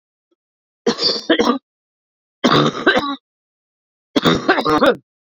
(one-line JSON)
{"three_cough_length": "5.2 s", "three_cough_amplitude": 30763, "three_cough_signal_mean_std_ratio": 0.48, "survey_phase": "beta (2021-08-13 to 2022-03-07)", "age": "18-44", "gender": "Female", "wearing_mask": "No", "symptom_cough_any": true, "symptom_runny_or_blocked_nose": true, "symptom_abdominal_pain": true, "symptom_fatigue": true, "symptom_fever_high_temperature": true, "symptom_change_to_sense_of_smell_or_taste": true, "smoker_status": "Current smoker (1 to 10 cigarettes per day)", "respiratory_condition_asthma": true, "respiratory_condition_other": false, "recruitment_source": "Test and Trace", "submission_delay": "1 day", "covid_test_result": "Positive", "covid_test_method": "RT-qPCR"}